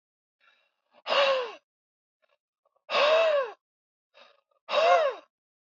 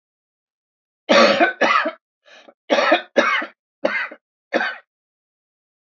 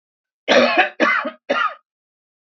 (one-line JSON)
{"exhalation_length": "5.6 s", "exhalation_amplitude": 11312, "exhalation_signal_mean_std_ratio": 0.43, "three_cough_length": "5.9 s", "three_cough_amplitude": 27354, "three_cough_signal_mean_std_ratio": 0.42, "cough_length": "2.5 s", "cough_amplitude": 27713, "cough_signal_mean_std_ratio": 0.49, "survey_phase": "beta (2021-08-13 to 2022-03-07)", "age": "45-64", "gender": "Female", "wearing_mask": "No", "symptom_cough_any": true, "symptom_runny_or_blocked_nose": true, "smoker_status": "Ex-smoker", "respiratory_condition_asthma": false, "respiratory_condition_other": false, "recruitment_source": "REACT", "submission_delay": "8 days", "covid_test_result": "Negative", "covid_test_method": "RT-qPCR", "influenza_a_test_result": "Negative", "influenza_b_test_result": "Negative"}